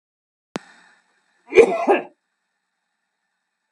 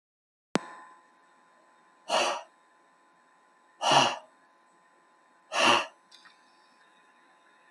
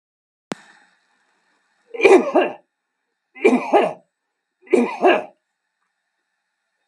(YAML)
cough_length: 3.7 s
cough_amplitude: 32767
cough_signal_mean_std_ratio: 0.24
exhalation_length: 7.7 s
exhalation_amplitude: 19901
exhalation_signal_mean_std_ratio: 0.3
three_cough_length: 6.9 s
three_cough_amplitude: 32768
three_cough_signal_mean_std_ratio: 0.33
survey_phase: beta (2021-08-13 to 2022-03-07)
age: 65+
gender: Male
wearing_mask: 'No'
symptom_none: true
smoker_status: Never smoked
respiratory_condition_asthma: false
respiratory_condition_other: false
recruitment_source: Test and Trace
submission_delay: 0 days
covid_test_result: Negative
covid_test_method: LFT